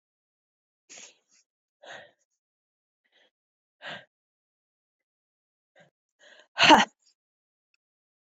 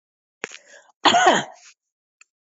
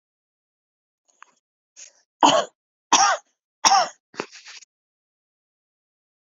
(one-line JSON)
{"exhalation_length": "8.4 s", "exhalation_amplitude": 19596, "exhalation_signal_mean_std_ratio": 0.15, "cough_length": "2.6 s", "cough_amplitude": 25586, "cough_signal_mean_std_ratio": 0.32, "three_cough_length": "6.3 s", "three_cough_amplitude": 25140, "three_cough_signal_mean_std_ratio": 0.26, "survey_phase": "beta (2021-08-13 to 2022-03-07)", "age": "45-64", "gender": "Female", "wearing_mask": "No", "symptom_loss_of_taste": true, "symptom_onset": "7 days", "smoker_status": "Never smoked", "respiratory_condition_asthma": false, "respiratory_condition_other": false, "recruitment_source": "REACT", "submission_delay": "3 days", "covid_test_result": "Negative", "covid_test_method": "RT-qPCR", "influenza_a_test_result": "Negative", "influenza_b_test_result": "Negative"}